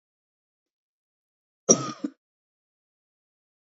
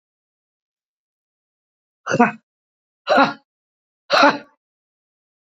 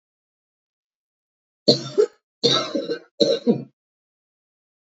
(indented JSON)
{
  "cough_length": "3.8 s",
  "cough_amplitude": 24418,
  "cough_signal_mean_std_ratio": 0.15,
  "exhalation_length": "5.5 s",
  "exhalation_amplitude": 27653,
  "exhalation_signal_mean_std_ratio": 0.27,
  "three_cough_length": "4.9 s",
  "three_cough_amplitude": 32768,
  "three_cough_signal_mean_std_ratio": 0.34,
  "survey_phase": "beta (2021-08-13 to 2022-03-07)",
  "age": "65+",
  "gender": "Female",
  "wearing_mask": "No",
  "symptom_cough_any": true,
  "smoker_status": "Ex-smoker",
  "respiratory_condition_asthma": false,
  "respiratory_condition_other": false,
  "recruitment_source": "REACT",
  "submission_delay": "2 days",
  "covid_test_result": "Negative",
  "covid_test_method": "RT-qPCR",
  "influenza_a_test_result": "Negative",
  "influenza_b_test_result": "Negative"
}